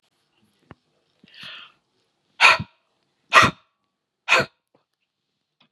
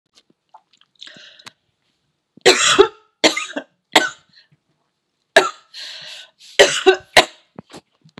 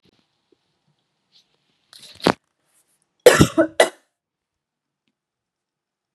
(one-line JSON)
{"exhalation_length": "5.7 s", "exhalation_amplitude": 32766, "exhalation_signal_mean_std_ratio": 0.23, "three_cough_length": "8.2 s", "three_cough_amplitude": 32768, "three_cough_signal_mean_std_ratio": 0.29, "cough_length": "6.1 s", "cough_amplitude": 32768, "cough_signal_mean_std_ratio": 0.19, "survey_phase": "beta (2021-08-13 to 2022-03-07)", "age": "45-64", "gender": "Female", "wearing_mask": "No", "symptom_cough_any": true, "symptom_sore_throat": true, "symptom_headache": true, "symptom_onset": "5 days", "smoker_status": "Never smoked", "respiratory_condition_asthma": false, "respiratory_condition_other": false, "recruitment_source": "Test and Trace", "submission_delay": "2 days", "covid_test_result": "Negative", "covid_test_method": "ePCR"}